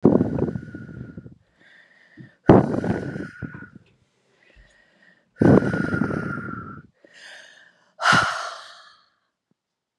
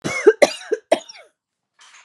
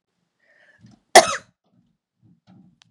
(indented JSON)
{
  "exhalation_length": "10.0 s",
  "exhalation_amplitude": 32768,
  "exhalation_signal_mean_std_ratio": 0.37,
  "three_cough_length": "2.0 s",
  "three_cough_amplitude": 32667,
  "three_cough_signal_mean_std_ratio": 0.31,
  "cough_length": "2.9 s",
  "cough_amplitude": 32768,
  "cough_signal_mean_std_ratio": 0.16,
  "survey_phase": "beta (2021-08-13 to 2022-03-07)",
  "age": "45-64",
  "gender": "Female",
  "wearing_mask": "No",
  "symptom_none": true,
  "smoker_status": "Never smoked",
  "respiratory_condition_asthma": false,
  "respiratory_condition_other": false,
  "recruitment_source": "REACT",
  "submission_delay": "2 days",
  "covid_test_result": "Negative",
  "covid_test_method": "RT-qPCR",
  "influenza_a_test_result": "Negative",
  "influenza_b_test_result": "Negative"
}